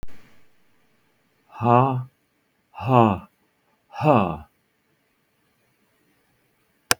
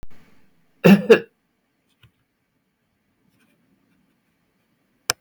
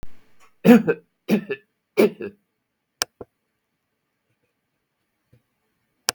exhalation_length: 7.0 s
exhalation_amplitude: 32766
exhalation_signal_mean_std_ratio: 0.31
cough_length: 5.2 s
cough_amplitude: 32766
cough_signal_mean_std_ratio: 0.2
three_cough_length: 6.1 s
three_cough_amplitude: 32766
three_cough_signal_mean_std_ratio: 0.24
survey_phase: beta (2021-08-13 to 2022-03-07)
age: 65+
gender: Male
wearing_mask: 'No'
symptom_none: true
smoker_status: Ex-smoker
respiratory_condition_asthma: false
respiratory_condition_other: false
recruitment_source: REACT
submission_delay: 3 days
covid_test_result: Negative
covid_test_method: RT-qPCR
influenza_a_test_result: Negative
influenza_b_test_result: Negative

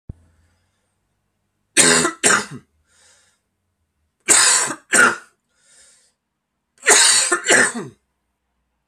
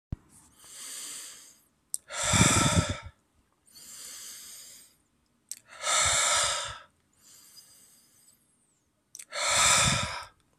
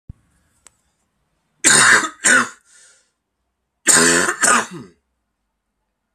three_cough_length: 8.9 s
three_cough_amplitude: 32768
three_cough_signal_mean_std_ratio: 0.39
exhalation_length: 10.6 s
exhalation_amplitude: 14188
exhalation_signal_mean_std_ratio: 0.44
cough_length: 6.1 s
cough_amplitude: 32768
cough_signal_mean_std_ratio: 0.39
survey_phase: alpha (2021-03-01 to 2021-08-12)
age: 18-44
gender: Male
wearing_mask: 'No'
symptom_cough_any: true
symptom_shortness_of_breath: true
symptom_fatigue: true
symptom_fever_high_temperature: true
symptom_headache: true
symptom_change_to_sense_of_smell_or_taste: true
symptom_loss_of_taste: true
symptom_onset: 4 days
smoker_status: Never smoked
respiratory_condition_asthma: false
respiratory_condition_other: false
recruitment_source: Test and Trace
submission_delay: 2 days
covid_test_result: Positive
covid_test_method: RT-qPCR
covid_ct_value: 27.1
covid_ct_gene: ORF1ab gene
covid_ct_mean: 27.6
covid_viral_load: 870 copies/ml
covid_viral_load_category: Minimal viral load (< 10K copies/ml)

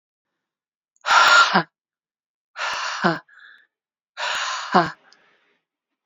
exhalation_length: 6.1 s
exhalation_amplitude: 30068
exhalation_signal_mean_std_ratio: 0.37
survey_phase: beta (2021-08-13 to 2022-03-07)
age: 18-44
gender: Female
wearing_mask: 'No'
symptom_cough_any: true
symptom_runny_or_blocked_nose: true
symptom_sore_throat: true
symptom_fatigue: true
symptom_headache: true
symptom_onset: 4 days
smoker_status: Never smoked
respiratory_condition_asthma: false
respiratory_condition_other: false
recruitment_source: Test and Trace
submission_delay: 1 day
covid_test_result: Positive
covid_test_method: ePCR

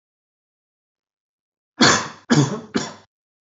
three_cough_length: 3.5 s
three_cough_amplitude: 28683
three_cough_signal_mean_std_ratio: 0.32
survey_phase: beta (2021-08-13 to 2022-03-07)
age: 18-44
gender: Male
wearing_mask: 'No'
symptom_sore_throat: true
smoker_status: Never smoked
respiratory_condition_asthma: false
respiratory_condition_other: false
recruitment_source: REACT
submission_delay: 1 day
covid_test_result: Negative
covid_test_method: RT-qPCR
influenza_a_test_result: Negative
influenza_b_test_result: Negative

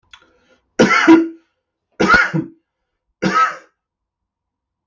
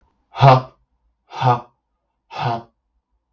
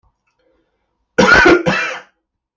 three_cough_length: 4.9 s
three_cough_amplitude: 32768
three_cough_signal_mean_std_ratio: 0.39
exhalation_length: 3.3 s
exhalation_amplitude: 32767
exhalation_signal_mean_std_ratio: 0.31
cough_length: 2.6 s
cough_amplitude: 32767
cough_signal_mean_std_ratio: 0.43
survey_phase: beta (2021-08-13 to 2022-03-07)
age: 45-64
gender: Male
wearing_mask: 'No'
symptom_none: true
smoker_status: Ex-smoker
respiratory_condition_asthma: false
respiratory_condition_other: false
recruitment_source: REACT
submission_delay: 3 days
covid_test_result: Negative
covid_test_method: RT-qPCR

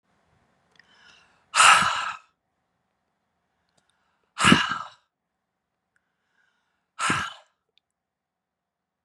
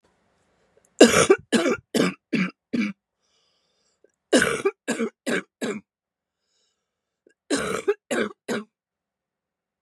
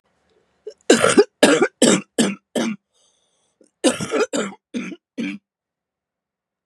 exhalation_length: 9.0 s
exhalation_amplitude: 31978
exhalation_signal_mean_std_ratio: 0.25
three_cough_length: 9.8 s
three_cough_amplitude: 32767
three_cough_signal_mean_std_ratio: 0.35
cough_length: 6.7 s
cough_amplitude: 32768
cough_signal_mean_std_ratio: 0.39
survey_phase: beta (2021-08-13 to 2022-03-07)
age: 45-64
gender: Female
wearing_mask: 'No'
symptom_cough_any: true
symptom_runny_or_blocked_nose: true
symptom_headache: true
symptom_change_to_sense_of_smell_or_taste: true
symptom_loss_of_taste: true
symptom_onset: 3 days
smoker_status: Never smoked
respiratory_condition_asthma: true
respiratory_condition_other: false
recruitment_source: Test and Trace
submission_delay: 1 day
covid_test_result: Positive
covid_test_method: RT-qPCR
covid_ct_value: 18.4
covid_ct_gene: ORF1ab gene
covid_ct_mean: 19.3
covid_viral_load: 460000 copies/ml
covid_viral_load_category: Low viral load (10K-1M copies/ml)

